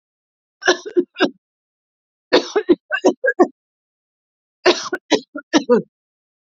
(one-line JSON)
{"three_cough_length": "6.6 s", "three_cough_amplitude": 30294, "three_cough_signal_mean_std_ratio": 0.35, "survey_phase": "beta (2021-08-13 to 2022-03-07)", "age": "18-44", "gender": "Female", "wearing_mask": "No", "symptom_none": true, "smoker_status": "Never smoked", "respiratory_condition_asthma": false, "respiratory_condition_other": false, "recruitment_source": "REACT", "submission_delay": "2 days", "covid_test_result": "Negative", "covid_test_method": "RT-qPCR", "influenza_a_test_result": "Negative", "influenza_b_test_result": "Negative"}